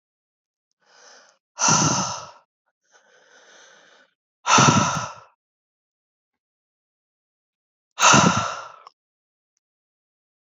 {"exhalation_length": "10.4 s", "exhalation_amplitude": 28439, "exhalation_signal_mean_std_ratio": 0.31, "survey_phase": "beta (2021-08-13 to 2022-03-07)", "age": "18-44", "gender": "Male", "wearing_mask": "No", "symptom_cough_any": true, "symptom_runny_or_blocked_nose": true, "symptom_headache": true, "symptom_change_to_sense_of_smell_or_taste": true, "symptom_loss_of_taste": true, "symptom_onset": "4 days", "smoker_status": "Current smoker (e-cigarettes or vapes only)", "respiratory_condition_asthma": false, "respiratory_condition_other": false, "recruitment_source": "Test and Trace", "submission_delay": "2 days", "covid_test_result": "Positive", "covid_test_method": "RT-qPCR", "covid_ct_value": 17.7, "covid_ct_gene": "ORF1ab gene", "covid_ct_mean": 18.5, "covid_viral_load": "870000 copies/ml", "covid_viral_load_category": "Low viral load (10K-1M copies/ml)"}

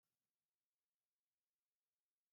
{"cough_length": "2.3 s", "cough_amplitude": 3, "cough_signal_mean_std_ratio": 0.31, "survey_phase": "beta (2021-08-13 to 2022-03-07)", "age": "18-44", "gender": "Female", "wearing_mask": "No", "symptom_none": true, "smoker_status": "Never smoked", "respiratory_condition_asthma": false, "respiratory_condition_other": false, "recruitment_source": "REACT", "submission_delay": "2 days", "covid_test_result": "Negative", "covid_test_method": "RT-qPCR", "influenza_a_test_result": "Negative", "influenza_b_test_result": "Negative"}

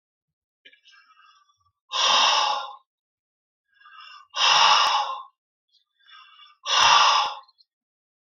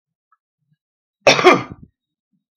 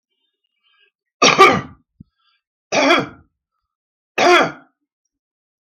{"exhalation_length": "8.3 s", "exhalation_amplitude": 22136, "exhalation_signal_mean_std_ratio": 0.43, "cough_length": "2.6 s", "cough_amplitude": 32768, "cough_signal_mean_std_ratio": 0.27, "three_cough_length": "5.6 s", "three_cough_amplitude": 32768, "three_cough_signal_mean_std_ratio": 0.34, "survey_phase": "beta (2021-08-13 to 2022-03-07)", "age": "65+", "gender": "Male", "wearing_mask": "No", "symptom_cough_any": true, "symptom_runny_or_blocked_nose": true, "symptom_onset": "12 days", "smoker_status": "Never smoked", "respiratory_condition_asthma": false, "respiratory_condition_other": true, "recruitment_source": "REACT", "submission_delay": "3 days", "covid_test_result": "Negative", "covid_test_method": "RT-qPCR", "influenza_a_test_result": "Negative", "influenza_b_test_result": "Negative"}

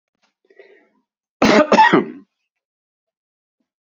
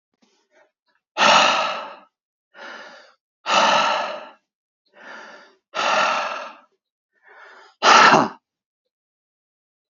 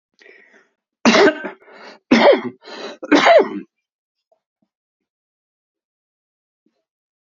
{"cough_length": "3.8 s", "cough_amplitude": 32767, "cough_signal_mean_std_ratio": 0.32, "exhalation_length": "9.9 s", "exhalation_amplitude": 29606, "exhalation_signal_mean_std_ratio": 0.39, "three_cough_length": "7.3 s", "three_cough_amplitude": 28859, "three_cough_signal_mean_std_ratio": 0.32, "survey_phase": "alpha (2021-03-01 to 2021-08-12)", "age": "65+", "gender": "Male", "wearing_mask": "No", "symptom_cough_any": true, "symptom_shortness_of_breath": true, "symptom_diarrhoea": true, "symptom_onset": "12 days", "smoker_status": "Ex-smoker", "respiratory_condition_asthma": false, "respiratory_condition_other": true, "recruitment_source": "REACT", "submission_delay": "2 days", "covid_test_result": "Negative", "covid_test_method": "RT-qPCR"}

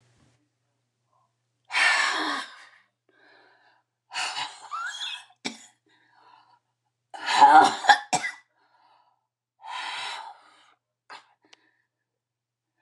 {"exhalation_length": "12.8 s", "exhalation_amplitude": 27359, "exhalation_signal_mean_std_ratio": 0.29, "survey_phase": "beta (2021-08-13 to 2022-03-07)", "age": "65+", "gender": "Female", "wearing_mask": "No", "symptom_none": true, "smoker_status": "Never smoked", "respiratory_condition_asthma": true, "respiratory_condition_other": false, "recruitment_source": "REACT", "submission_delay": "10 days", "covid_test_result": "Negative", "covid_test_method": "RT-qPCR"}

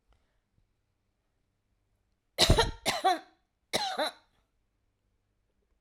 {"three_cough_length": "5.8 s", "three_cough_amplitude": 13686, "three_cough_signal_mean_std_ratio": 0.29, "survey_phase": "alpha (2021-03-01 to 2021-08-12)", "age": "45-64", "gender": "Female", "wearing_mask": "No", "symptom_abdominal_pain": true, "symptom_onset": "12 days", "smoker_status": "Never smoked", "respiratory_condition_asthma": false, "respiratory_condition_other": false, "recruitment_source": "REACT", "submission_delay": "1 day", "covid_test_result": "Negative", "covid_test_method": "RT-qPCR"}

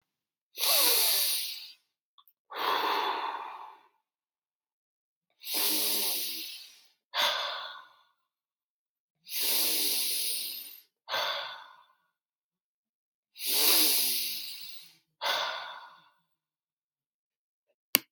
{"exhalation_length": "18.1 s", "exhalation_amplitude": 32767, "exhalation_signal_mean_std_ratio": 0.51, "survey_phase": "beta (2021-08-13 to 2022-03-07)", "age": "45-64", "gender": "Male", "wearing_mask": "No", "symptom_none": true, "smoker_status": "Ex-smoker", "respiratory_condition_asthma": false, "respiratory_condition_other": false, "recruitment_source": "REACT", "submission_delay": "0 days", "covid_test_result": "Negative", "covid_test_method": "RT-qPCR"}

